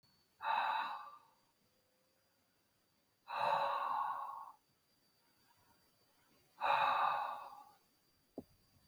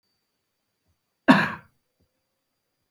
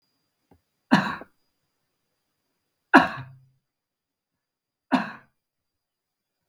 {"exhalation_length": "8.9 s", "exhalation_amplitude": 2761, "exhalation_signal_mean_std_ratio": 0.46, "cough_length": "2.9 s", "cough_amplitude": 27157, "cough_signal_mean_std_ratio": 0.19, "three_cough_length": "6.5 s", "three_cough_amplitude": 32768, "three_cough_signal_mean_std_ratio": 0.19, "survey_phase": "beta (2021-08-13 to 2022-03-07)", "age": "65+", "gender": "Male", "wearing_mask": "No", "symptom_none": true, "smoker_status": "Never smoked", "respiratory_condition_asthma": false, "respiratory_condition_other": false, "recruitment_source": "REACT", "submission_delay": "1 day", "covid_test_result": "Negative", "covid_test_method": "RT-qPCR", "influenza_a_test_result": "Negative", "influenza_b_test_result": "Negative"}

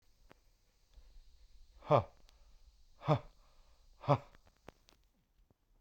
{"exhalation_length": "5.8 s", "exhalation_amplitude": 6715, "exhalation_signal_mean_std_ratio": 0.23, "survey_phase": "beta (2021-08-13 to 2022-03-07)", "age": "45-64", "gender": "Male", "wearing_mask": "Yes", "symptom_new_continuous_cough": true, "symptom_runny_or_blocked_nose": true, "symptom_shortness_of_breath": true, "symptom_abdominal_pain": true, "symptom_fatigue": true, "symptom_fever_high_temperature": true, "symptom_headache": true, "symptom_onset": "8 days", "smoker_status": "Ex-smoker", "respiratory_condition_asthma": false, "respiratory_condition_other": false, "recruitment_source": "Test and Trace", "submission_delay": "2 days", "covid_test_result": "Positive", "covid_test_method": "RT-qPCR"}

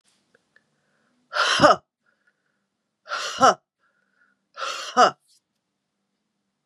{"exhalation_length": "6.7 s", "exhalation_amplitude": 31041, "exhalation_signal_mean_std_ratio": 0.28, "survey_phase": "beta (2021-08-13 to 2022-03-07)", "age": "45-64", "gender": "Female", "wearing_mask": "No", "symptom_runny_or_blocked_nose": true, "smoker_status": "Ex-smoker", "respiratory_condition_asthma": false, "respiratory_condition_other": false, "recruitment_source": "Test and Trace", "submission_delay": "1 day", "covid_test_result": "Positive", "covid_test_method": "ePCR"}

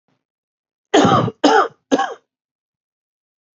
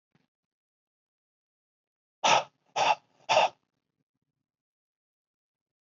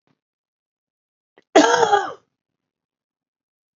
{"three_cough_length": "3.6 s", "three_cough_amplitude": 28152, "three_cough_signal_mean_std_ratio": 0.37, "exhalation_length": "5.8 s", "exhalation_amplitude": 12001, "exhalation_signal_mean_std_ratio": 0.25, "cough_length": "3.8 s", "cough_amplitude": 29748, "cough_signal_mean_std_ratio": 0.27, "survey_phase": "beta (2021-08-13 to 2022-03-07)", "age": "18-44", "gender": "Male", "wearing_mask": "No", "symptom_runny_or_blocked_nose": true, "symptom_shortness_of_breath": true, "symptom_headache": true, "smoker_status": "Ex-smoker", "respiratory_condition_asthma": true, "respiratory_condition_other": false, "recruitment_source": "REACT", "submission_delay": "2 days", "covid_test_result": "Negative", "covid_test_method": "RT-qPCR", "influenza_a_test_result": "Negative", "influenza_b_test_result": "Negative"}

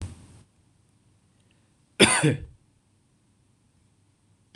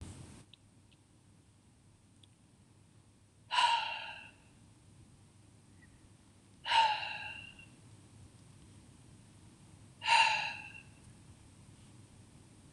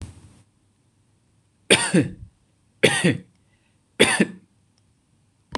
{"cough_length": "4.6 s", "cough_amplitude": 26027, "cough_signal_mean_std_ratio": 0.24, "exhalation_length": "12.7 s", "exhalation_amplitude": 6934, "exhalation_signal_mean_std_ratio": 0.34, "three_cough_length": "5.6 s", "three_cough_amplitude": 26027, "three_cough_signal_mean_std_ratio": 0.31, "survey_phase": "beta (2021-08-13 to 2022-03-07)", "age": "18-44", "gender": "Male", "wearing_mask": "No", "symptom_none": true, "smoker_status": "Never smoked", "respiratory_condition_asthma": false, "respiratory_condition_other": false, "recruitment_source": "REACT", "submission_delay": "5 days", "covid_test_result": "Negative", "covid_test_method": "RT-qPCR", "influenza_a_test_result": "Negative", "influenza_b_test_result": "Negative"}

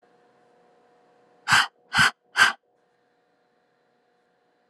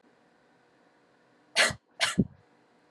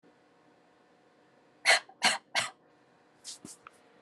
{"exhalation_length": "4.7 s", "exhalation_amplitude": 22545, "exhalation_signal_mean_std_ratio": 0.26, "cough_length": "2.9 s", "cough_amplitude": 11627, "cough_signal_mean_std_ratio": 0.28, "three_cough_length": "4.0 s", "three_cough_amplitude": 12288, "three_cough_signal_mean_std_ratio": 0.27, "survey_phase": "alpha (2021-03-01 to 2021-08-12)", "age": "18-44", "gender": "Female", "wearing_mask": "Yes", "symptom_none": true, "smoker_status": "Never smoked", "respiratory_condition_asthma": false, "respiratory_condition_other": false, "recruitment_source": "REACT", "submission_delay": "1 day", "covid_test_result": "Negative", "covid_test_method": "RT-qPCR"}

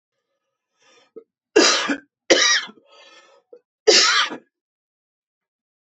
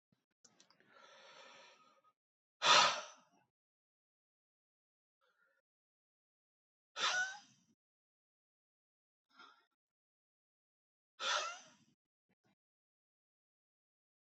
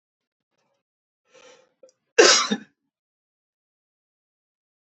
{"three_cough_length": "6.0 s", "three_cough_amplitude": 28514, "three_cough_signal_mean_std_ratio": 0.35, "exhalation_length": "14.3 s", "exhalation_amplitude": 5341, "exhalation_signal_mean_std_ratio": 0.2, "cough_length": "4.9 s", "cough_amplitude": 30124, "cough_signal_mean_std_ratio": 0.2, "survey_phase": "beta (2021-08-13 to 2022-03-07)", "age": "45-64", "gender": "Male", "wearing_mask": "No", "symptom_none": true, "smoker_status": "Ex-smoker", "respiratory_condition_asthma": false, "respiratory_condition_other": false, "recruitment_source": "REACT", "submission_delay": "18 days", "covid_test_result": "Negative", "covid_test_method": "RT-qPCR", "influenza_a_test_result": "Negative", "influenza_b_test_result": "Negative"}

